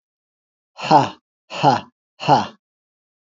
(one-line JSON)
{"exhalation_length": "3.2 s", "exhalation_amplitude": 28517, "exhalation_signal_mean_std_ratio": 0.34, "survey_phase": "alpha (2021-03-01 to 2021-08-12)", "age": "45-64", "gender": "Male", "wearing_mask": "No", "symptom_none": true, "smoker_status": "Current smoker (1 to 10 cigarettes per day)", "respiratory_condition_asthma": false, "respiratory_condition_other": false, "recruitment_source": "REACT", "submission_delay": "7 days", "covid_test_result": "Negative", "covid_test_method": "RT-qPCR"}